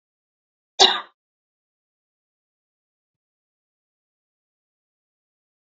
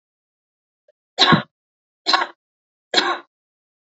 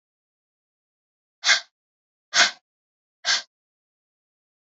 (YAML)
cough_length: 5.6 s
cough_amplitude: 29412
cough_signal_mean_std_ratio: 0.12
three_cough_length: 3.9 s
three_cough_amplitude: 28773
three_cough_signal_mean_std_ratio: 0.3
exhalation_length: 4.7 s
exhalation_amplitude: 22849
exhalation_signal_mean_std_ratio: 0.23
survey_phase: beta (2021-08-13 to 2022-03-07)
age: 18-44
gender: Female
wearing_mask: 'No'
symptom_cough_any: true
symptom_sore_throat: true
symptom_fatigue: true
symptom_headache: true
symptom_onset: 11 days
smoker_status: Never smoked
respiratory_condition_asthma: false
respiratory_condition_other: false
recruitment_source: REACT
submission_delay: 0 days
covid_test_result: Negative
covid_test_method: RT-qPCR
influenza_a_test_result: Negative
influenza_b_test_result: Negative